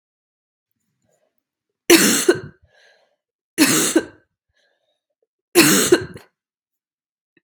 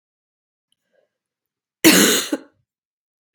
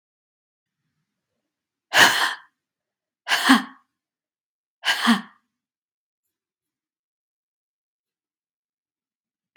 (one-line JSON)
{"three_cough_length": "7.4 s", "three_cough_amplitude": 32768, "three_cough_signal_mean_std_ratio": 0.32, "cough_length": "3.3 s", "cough_amplitude": 32768, "cough_signal_mean_std_ratio": 0.28, "exhalation_length": "9.6 s", "exhalation_amplitude": 32767, "exhalation_signal_mean_std_ratio": 0.24, "survey_phase": "beta (2021-08-13 to 2022-03-07)", "age": "18-44", "gender": "Female", "wearing_mask": "No", "symptom_cough_any": true, "symptom_runny_or_blocked_nose": true, "symptom_fatigue": true, "symptom_headache": true, "symptom_other": true, "symptom_onset": "4 days", "smoker_status": "Never smoked", "respiratory_condition_asthma": false, "respiratory_condition_other": false, "recruitment_source": "Test and Trace", "submission_delay": "2 days", "covid_test_result": "Positive", "covid_test_method": "RT-qPCR", "covid_ct_value": 19.8, "covid_ct_gene": "N gene", "covid_ct_mean": 19.9, "covid_viral_load": "300000 copies/ml", "covid_viral_load_category": "Low viral load (10K-1M copies/ml)"}